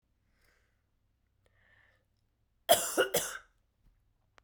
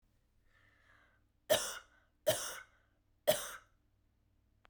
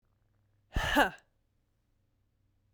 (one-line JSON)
{"cough_length": "4.4 s", "cough_amplitude": 11015, "cough_signal_mean_std_ratio": 0.24, "three_cough_length": "4.7 s", "three_cough_amplitude": 5507, "three_cough_signal_mean_std_ratio": 0.28, "exhalation_length": "2.7 s", "exhalation_amplitude": 9087, "exhalation_signal_mean_std_ratio": 0.28, "survey_phase": "beta (2021-08-13 to 2022-03-07)", "age": "18-44", "gender": "Female", "wearing_mask": "No", "symptom_runny_or_blocked_nose": true, "symptom_shortness_of_breath": true, "symptom_loss_of_taste": true, "symptom_onset": "3 days", "smoker_status": "Ex-smoker", "respiratory_condition_asthma": false, "respiratory_condition_other": false, "recruitment_source": "Test and Trace", "submission_delay": "2 days", "covid_test_result": "Positive", "covid_test_method": "RT-qPCR"}